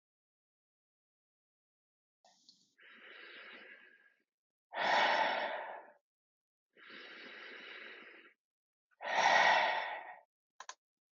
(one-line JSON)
{"exhalation_length": "11.2 s", "exhalation_amplitude": 5072, "exhalation_signal_mean_std_ratio": 0.36, "survey_phase": "beta (2021-08-13 to 2022-03-07)", "age": "18-44", "gender": "Male", "wearing_mask": "No", "symptom_none": true, "smoker_status": "Ex-smoker", "respiratory_condition_asthma": false, "respiratory_condition_other": false, "recruitment_source": "REACT", "submission_delay": "1 day", "covid_test_result": "Negative", "covid_test_method": "RT-qPCR", "influenza_a_test_result": "Negative", "influenza_b_test_result": "Negative"}